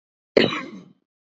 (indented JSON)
{
  "cough_length": "1.4 s",
  "cough_amplitude": 28432,
  "cough_signal_mean_std_ratio": 0.29,
  "survey_phase": "beta (2021-08-13 to 2022-03-07)",
  "age": "45-64",
  "gender": "Female",
  "wearing_mask": "No",
  "symptom_cough_any": true,
  "symptom_runny_or_blocked_nose": true,
  "symptom_shortness_of_breath": true,
  "symptom_fatigue": true,
  "symptom_headache": true,
  "symptom_change_to_sense_of_smell_or_taste": true,
  "symptom_onset": "3 days",
  "smoker_status": "Never smoked",
  "respiratory_condition_asthma": true,
  "respiratory_condition_other": false,
  "recruitment_source": "Test and Trace",
  "submission_delay": "1 day",
  "covid_test_result": "Positive",
  "covid_test_method": "RT-qPCR",
  "covid_ct_value": 18.1,
  "covid_ct_gene": "ORF1ab gene",
  "covid_ct_mean": 18.2,
  "covid_viral_load": "1000000 copies/ml",
  "covid_viral_load_category": "High viral load (>1M copies/ml)"
}